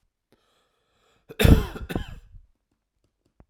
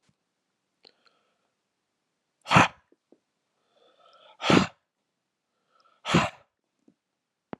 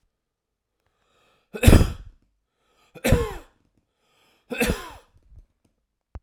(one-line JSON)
{"cough_length": "3.5 s", "cough_amplitude": 26959, "cough_signal_mean_std_ratio": 0.24, "exhalation_length": "7.6 s", "exhalation_amplitude": 23666, "exhalation_signal_mean_std_ratio": 0.21, "three_cough_length": "6.2 s", "three_cough_amplitude": 32767, "three_cough_signal_mean_std_ratio": 0.24, "survey_phase": "alpha (2021-03-01 to 2021-08-12)", "age": "45-64", "gender": "Male", "wearing_mask": "No", "symptom_none": true, "smoker_status": "Ex-smoker", "respiratory_condition_asthma": false, "respiratory_condition_other": false, "recruitment_source": "REACT", "submission_delay": "4 days", "covid_test_result": "Negative", "covid_test_method": "RT-qPCR"}